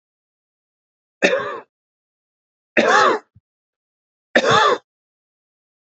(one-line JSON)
{"three_cough_length": "5.9 s", "three_cough_amplitude": 28101, "three_cough_signal_mean_std_ratio": 0.34, "survey_phase": "beta (2021-08-13 to 2022-03-07)", "age": "45-64", "gender": "Male", "wearing_mask": "No", "symptom_none": true, "smoker_status": "Never smoked", "respiratory_condition_asthma": false, "respiratory_condition_other": false, "recruitment_source": "REACT", "submission_delay": "1 day", "covid_test_result": "Positive", "covid_test_method": "RT-qPCR", "covid_ct_value": 19.8, "covid_ct_gene": "E gene", "influenza_a_test_result": "Negative", "influenza_b_test_result": "Negative"}